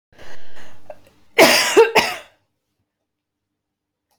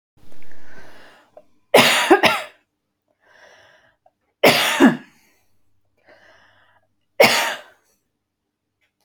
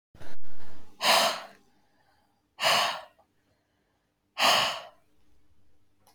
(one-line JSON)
{"cough_length": "4.2 s", "cough_amplitude": 31009, "cough_signal_mean_std_ratio": 0.43, "three_cough_length": "9.0 s", "three_cough_amplitude": 30621, "three_cough_signal_mean_std_ratio": 0.37, "exhalation_length": "6.1 s", "exhalation_amplitude": 14932, "exhalation_signal_mean_std_ratio": 0.5, "survey_phase": "alpha (2021-03-01 to 2021-08-12)", "age": "45-64", "gender": "Female", "wearing_mask": "No", "symptom_none": true, "smoker_status": "Never smoked", "respiratory_condition_asthma": true, "respiratory_condition_other": false, "recruitment_source": "REACT", "submission_delay": "2 days", "covid_test_result": "Negative", "covid_test_method": "RT-qPCR"}